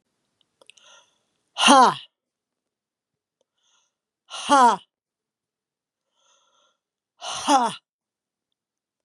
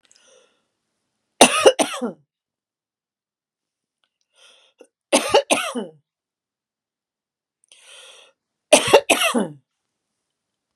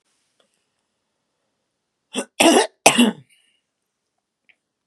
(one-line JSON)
{"exhalation_length": "9.0 s", "exhalation_amplitude": 27809, "exhalation_signal_mean_std_ratio": 0.25, "three_cough_length": "10.8 s", "three_cough_amplitude": 32768, "three_cough_signal_mean_std_ratio": 0.26, "cough_length": "4.9 s", "cough_amplitude": 32768, "cough_signal_mean_std_ratio": 0.26, "survey_phase": "beta (2021-08-13 to 2022-03-07)", "age": "45-64", "gender": "Female", "wearing_mask": "No", "symptom_shortness_of_breath": true, "smoker_status": "Never smoked", "respiratory_condition_asthma": false, "respiratory_condition_other": false, "recruitment_source": "REACT", "submission_delay": "0 days", "covid_test_result": "Negative", "covid_test_method": "RT-qPCR", "influenza_a_test_result": "Negative", "influenza_b_test_result": "Negative"}